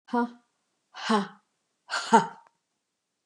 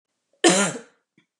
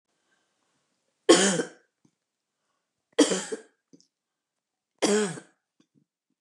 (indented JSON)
{
  "exhalation_length": "3.3 s",
  "exhalation_amplitude": 20267,
  "exhalation_signal_mean_std_ratio": 0.32,
  "cough_length": "1.4 s",
  "cough_amplitude": 23885,
  "cough_signal_mean_std_ratio": 0.36,
  "three_cough_length": "6.4 s",
  "three_cough_amplitude": 25186,
  "three_cough_signal_mean_std_ratio": 0.27,
  "survey_phase": "beta (2021-08-13 to 2022-03-07)",
  "age": "65+",
  "gender": "Female",
  "wearing_mask": "No",
  "symptom_none": true,
  "smoker_status": "Current smoker (1 to 10 cigarettes per day)",
  "respiratory_condition_asthma": false,
  "respiratory_condition_other": false,
  "recruitment_source": "REACT",
  "submission_delay": "2 days",
  "covid_test_result": "Negative",
  "covid_test_method": "RT-qPCR",
  "influenza_a_test_result": "Unknown/Void",
  "influenza_b_test_result": "Unknown/Void"
}